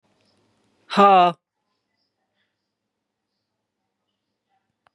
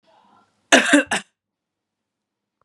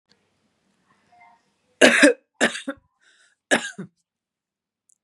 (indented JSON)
{
  "exhalation_length": "4.9 s",
  "exhalation_amplitude": 31261,
  "exhalation_signal_mean_std_ratio": 0.21,
  "cough_length": "2.6 s",
  "cough_amplitude": 32767,
  "cough_signal_mean_std_ratio": 0.28,
  "three_cough_length": "5.0 s",
  "three_cough_amplitude": 32767,
  "three_cough_signal_mean_std_ratio": 0.26,
  "survey_phase": "beta (2021-08-13 to 2022-03-07)",
  "age": "45-64",
  "gender": "Female",
  "wearing_mask": "Yes",
  "symptom_runny_or_blocked_nose": true,
  "symptom_sore_throat": true,
  "symptom_headache": true,
  "symptom_onset": "3 days",
  "smoker_status": "Never smoked",
  "respiratory_condition_asthma": false,
  "respiratory_condition_other": false,
  "recruitment_source": "Test and Trace",
  "submission_delay": "1 day",
  "covid_test_result": "Positive",
  "covid_test_method": "RT-qPCR",
  "covid_ct_value": 21.6,
  "covid_ct_gene": "ORF1ab gene",
  "covid_ct_mean": 22.6,
  "covid_viral_load": "38000 copies/ml",
  "covid_viral_load_category": "Low viral load (10K-1M copies/ml)"
}